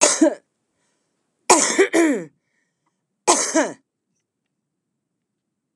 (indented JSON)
{
  "cough_length": "5.8 s",
  "cough_amplitude": 32687,
  "cough_signal_mean_std_ratio": 0.37,
  "survey_phase": "beta (2021-08-13 to 2022-03-07)",
  "age": "45-64",
  "gender": "Female",
  "wearing_mask": "No",
  "symptom_none": true,
  "smoker_status": "Current smoker (1 to 10 cigarettes per day)",
  "respiratory_condition_asthma": false,
  "respiratory_condition_other": false,
  "recruitment_source": "REACT",
  "submission_delay": "5 days",
  "covid_test_result": "Negative",
  "covid_test_method": "RT-qPCR",
  "influenza_a_test_result": "Negative",
  "influenza_b_test_result": "Negative"
}